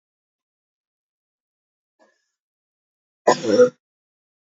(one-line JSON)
{"cough_length": "4.4 s", "cough_amplitude": 27910, "cough_signal_mean_std_ratio": 0.21, "survey_phase": "beta (2021-08-13 to 2022-03-07)", "age": "18-44", "gender": "Female", "wearing_mask": "No", "symptom_cough_any": true, "symptom_runny_or_blocked_nose": true, "symptom_sore_throat": true, "symptom_onset": "2 days", "smoker_status": "Never smoked", "respiratory_condition_asthma": false, "respiratory_condition_other": false, "recruitment_source": "Test and Trace", "submission_delay": "1 day", "covid_test_result": "Positive", "covid_test_method": "ePCR"}